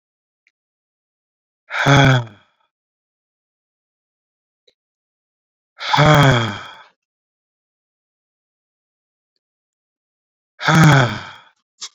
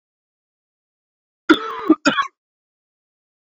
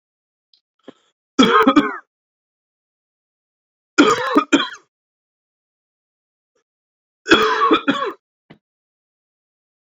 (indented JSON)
{
  "exhalation_length": "11.9 s",
  "exhalation_amplitude": 28289,
  "exhalation_signal_mean_std_ratio": 0.31,
  "cough_length": "3.4 s",
  "cough_amplitude": 27837,
  "cough_signal_mean_std_ratio": 0.25,
  "three_cough_length": "9.9 s",
  "three_cough_amplitude": 31177,
  "three_cough_signal_mean_std_ratio": 0.32,
  "survey_phase": "beta (2021-08-13 to 2022-03-07)",
  "age": "18-44",
  "gender": "Male",
  "wearing_mask": "No",
  "symptom_cough_any": true,
  "symptom_runny_or_blocked_nose": true,
  "symptom_sore_throat": true,
  "symptom_fatigue": true,
  "symptom_fever_high_temperature": true,
  "symptom_headache": true,
  "symptom_change_to_sense_of_smell_or_taste": true,
  "symptom_loss_of_taste": true,
  "symptom_onset": "3 days",
  "smoker_status": "Current smoker (e-cigarettes or vapes only)",
  "respiratory_condition_asthma": false,
  "respiratory_condition_other": false,
  "recruitment_source": "Test and Trace",
  "submission_delay": "1 day",
  "covid_test_result": "Positive",
  "covid_test_method": "RT-qPCR",
  "covid_ct_value": 19.2,
  "covid_ct_gene": "ORF1ab gene"
}